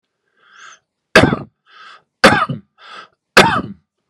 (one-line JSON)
{"three_cough_length": "4.1 s", "three_cough_amplitude": 32768, "three_cough_signal_mean_std_ratio": 0.33, "survey_phase": "beta (2021-08-13 to 2022-03-07)", "age": "18-44", "gender": "Male", "wearing_mask": "No", "symptom_runny_or_blocked_nose": true, "symptom_shortness_of_breath": true, "symptom_diarrhoea": true, "symptom_fatigue": true, "smoker_status": "Ex-smoker", "respiratory_condition_asthma": false, "respiratory_condition_other": false, "recruitment_source": "Test and Trace", "submission_delay": "3 days", "covid_test_method": "RT-qPCR", "covid_ct_value": 19.5, "covid_ct_gene": "ORF1ab gene", "covid_ct_mean": 19.9, "covid_viral_load": "290000 copies/ml", "covid_viral_load_category": "Low viral load (10K-1M copies/ml)"}